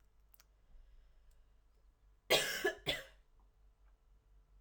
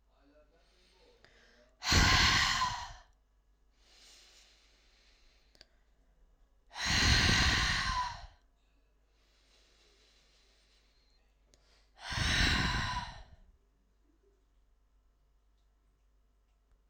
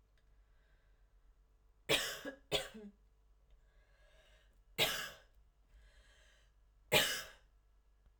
{"cough_length": "4.6 s", "cough_amplitude": 4316, "cough_signal_mean_std_ratio": 0.3, "exhalation_length": "16.9 s", "exhalation_amplitude": 7416, "exhalation_signal_mean_std_ratio": 0.38, "three_cough_length": "8.2 s", "three_cough_amplitude": 5301, "three_cough_signal_mean_std_ratio": 0.31, "survey_phase": "alpha (2021-03-01 to 2021-08-12)", "age": "18-44", "gender": "Male", "wearing_mask": "No", "symptom_cough_any": true, "symptom_headache": true, "smoker_status": "Ex-smoker", "respiratory_condition_asthma": false, "respiratory_condition_other": false, "recruitment_source": "Test and Trace", "submission_delay": "2 days", "covid_test_result": "Positive", "covid_test_method": "RT-qPCR", "covid_ct_value": 22.4, "covid_ct_gene": "ORF1ab gene", "covid_ct_mean": 23.4, "covid_viral_load": "21000 copies/ml", "covid_viral_load_category": "Low viral load (10K-1M copies/ml)"}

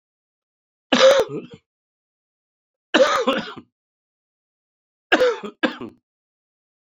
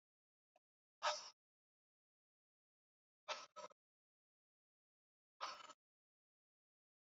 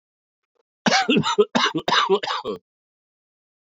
{"three_cough_length": "7.0 s", "three_cough_amplitude": 32767, "three_cough_signal_mean_std_ratio": 0.33, "exhalation_length": "7.2 s", "exhalation_amplitude": 1368, "exhalation_signal_mean_std_ratio": 0.21, "cough_length": "3.7 s", "cough_amplitude": 22226, "cough_signal_mean_std_ratio": 0.47, "survey_phase": "beta (2021-08-13 to 2022-03-07)", "age": "65+", "gender": "Male", "wearing_mask": "No", "symptom_cough_any": true, "symptom_runny_or_blocked_nose": true, "symptom_headache": true, "symptom_change_to_sense_of_smell_or_taste": true, "symptom_onset": "4 days", "smoker_status": "Ex-smoker", "respiratory_condition_asthma": false, "respiratory_condition_other": false, "recruitment_source": "Test and Trace", "submission_delay": "2 days", "covid_test_result": "Positive", "covid_test_method": "RT-qPCR"}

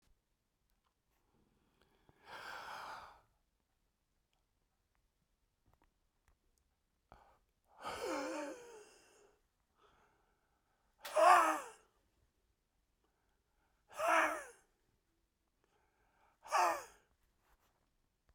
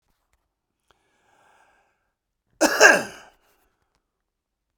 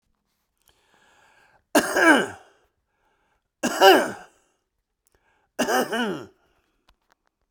{"exhalation_length": "18.3 s", "exhalation_amplitude": 6195, "exhalation_signal_mean_std_ratio": 0.24, "cough_length": "4.8 s", "cough_amplitude": 32768, "cough_signal_mean_std_ratio": 0.21, "three_cough_length": "7.5 s", "three_cough_amplitude": 32768, "three_cough_signal_mean_std_ratio": 0.32, "survey_phase": "beta (2021-08-13 to 2022-03-07)", "age": "65+", "gender": "Male", "wearing_mask": "No", "symptom_cough_any": true, "symptom_fatigue": true, "smoker_status": "Never smoked", "respiratory_condition_asthma": true, "respiratory_condition_other": false, "recruitment_source": "Test and Trace", "submission_delay": "2 days", "covid_test_result": "Positive", "covid_test_method": "RT-qPCR", "covid_ct_value": 18.9, "covid_ct_gene": "ORF1ab gene"}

